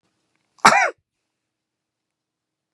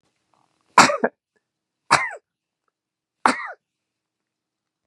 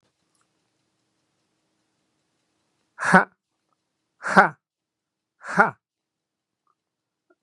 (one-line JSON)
{"cough_length": "2.7 s", "cough_amplitude": 32768, "cough_signal_mean_std_ratio": 0.22, "three_cough_length": "4.9 s", "three_cough_amplitude": 32768, "three_cough_signal_mean_std_ratio": 0.23, "exhalation_length": "7.4 s", "exhalation_amplitude": 32767, "exhalation_signal_mean_std_ratio": 0.19, "survey_phase": "beta (2021-08-13 to 2022-03-07)", "age": "65+", "gender": "Male", "wearing_mask": "No", "symptom_runny_or_blocked_nose": true, "symptom_fatigue": true, "smoker_status": "Ex-smoker", "respiratory_condition_asthma": false, "respiratory_condition_other": false, "recruitment_source": "REACT", "submission_delay": "3 days", "covid_test_result": "Negative", "covid_test_method": "RT-qPCR", "influenza_a_test_result": "Negative", "influenza_b_test_result": "Negative"}